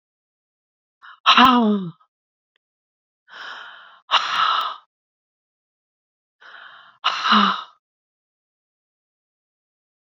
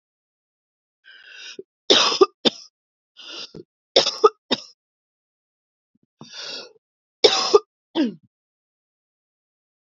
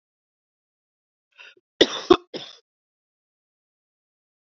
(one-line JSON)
{"exhalation_length": "10.1 s", "exhalation_amplitude": 28576, "exhalation_signal_mean_std_ratio": 0.32, "three_cough_length": "9.8 s", "three_cough_amplitude": 31349, "three_cough_signal_mean_std_ratio": 0.26, "cough_length": "4.5 s", "cough_amplitude": 28931, "cough_signal_mean_std_ratio": 0.14, "survey_phase": "beta (2021-08-13 to 2022-03-07)", "age": "45-64", "gender": "Female", "wearing_mask": "No", "symptom_cough_any": true, "symptom_runny_or_blocked_nose": true, "symptom_sore_throat": true, "symptom_fatigue": true, "symptom_headache": true, "symptom_onset": "2 days", "smoker_status": "Current smoker (e-cigarettes or vapes only)", "respiratory_condition_asthma": false, "respiratory_condition_other": false, "recruitment_source": "Test and Trace", "submission_delay": "2 days", "covid_test_result": "Positive", "covid_test_method": "RT-qPCR", "covid_ct_value": 24.4, "covid_ct_gene": "N gene"}